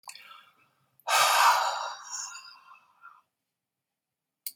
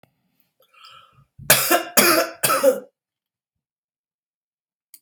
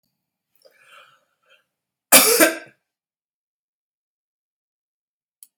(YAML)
exhalation_length: 4.6 s
exhalation_amplitude: 12842
exhalation_signal_mean_std_ratio: 0.38
three_cough_length: 5.0 s
three_cough_amplitude: 32768
three_cough_signal_mean_std_ratio: 0.35
cough_length: 5.6 s
cough_amplitude: 32768
cough_signal_mean_std_ratio: 0.21
survey_phase: beta (2021-08-13 to 2022-03-07)
age: 45-64
gender: Female
wearing_mask: 'No'
symptom_none: true
symptom_onset: 7 days
smoker_status: Ex-smoker
respiratory_condition_asthma: false
respiratory_condition_other: false
recruitment_source: REACT
submission_delay: 4 days
covid_test_result: Negative
covid_test_method: RT-qPCR
influenza_a_test_result: Unknown/Void
influenza_b_test_result: Unknown/Void